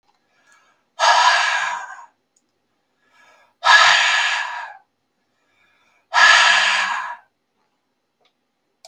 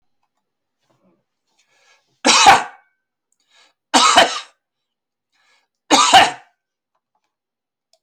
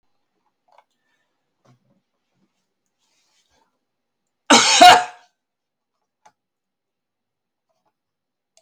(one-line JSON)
{"exhalation_length": "8.9 s", "exhalation_amplitude": 32768, "exhalation_signal_mean_std_ratio": 0.44, "three_cough_length": "8.0 s", "three_cough_amplitude": 32768, "three_cough_signal_mean_std_ratio": 0.3, "cough_length": "8.6 s", "cough_amplitude": 32768, "cough_signal_mean_std_ratio": 0.19, "survey_phase": "beta (2021-08-13 to 2022-03-07)", "age": "65+", "gender": "Male", "wearing_mask": "No", "symptom_none": true, "smoker_status": "Ex-smoker", "respiratory_condition_asthma": false, "respiratory_condition_other": false, "recruitment_source": "REACT", "submission_delay": "3 days", "covid_test_result": "Negative", "covid_test_method": "RT-qPCR", "influenza_a_test_result": "Negative", "influenza_b_test_result": "Negative"}